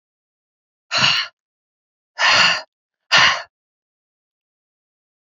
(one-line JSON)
{"exhalation_length": "5.4 s", "exhalation_amplitude": 29740, "exhalation_signal_mean_std_ratio": 0.34, "survey_phase": "alpha (2021-03-01 to 2021-08-12)", "age": "65+", "gender": "Female", "wearing_mask": "No", "symptom_none": true, "smoker_status": "Ex-smoker", "respiratory_condition_asthma": false, "respiratory_condition_other": false, "recruitment_source": "REACT", "submission_delay": "1 day", "covid_test_result": "Negative", "covid_test_method": "RT-qPCR"}